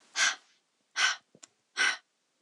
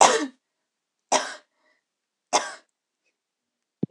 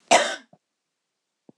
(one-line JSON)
{"exhalation_length": "2.4 s", "exhalation_amplitude": 7550, "exhalation_signal_mean_std_ratio": 0.39, "three_cough_length": "3.9 s", "three_cough_amplitude": 26013, "three_cough_signal_mean_std_ratio": 0.26, "cough_length": "1.6 s", "cough_amplitude": 23904, "cough_signal_mean_std_ratio": 0.27, "survey_phase": "beta (2021-08-13 to 2022-03-07)", "age": "18-44", "gender": "Female", "wearing_mask": "No", "symptom_none": true, "smoker_status": "Never smoked", "respiratory_condition_asthma": false, "respiratory_condition_other": false, "recruitment_source": "Test and Trace", "submission_delay": "2 days", "covid_test_result": "Positive", "covid_test_method": "RT-qPCR"}